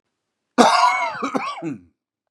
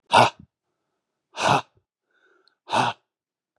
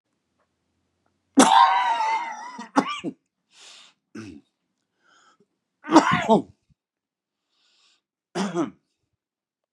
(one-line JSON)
{"cough_length": "2.3 s", "cough_amplitude": 32768, "cough_signal_mean_std_ratio": 0.49, "exhalation_length": "3.6 s", "exhalation_amplitude": 28010, "exhalation_signal_mean_std_ratio": 0.31, "three_cough_length": "9.7 s", "three_cough_amplitude": 32722, "three_cough_signal_mean_std_ratio": 0.33, "survey_phase": "beta (2021-08-13 to 2022-03-07)", "age": "45-64", "gender": "Male", "wearing_mask": "No", "symptom_cough_any": true, "symptom_runny_or_blocked_nose": true, "symptom_sore_throat": true, "symptom_onset": "4 days", "smoker_status": "Ex-smoker", "respiratory_condition_asthma": false, "respiratory_condition_other": false, "recruitment_source": "Test and Trace", "submission_delay": "2 days", "covid_test_result": "Positive", "covid_test_method": "RT-qPCR", "covid_ct_value": 20.6, "covid_ct_gene": "N gene"}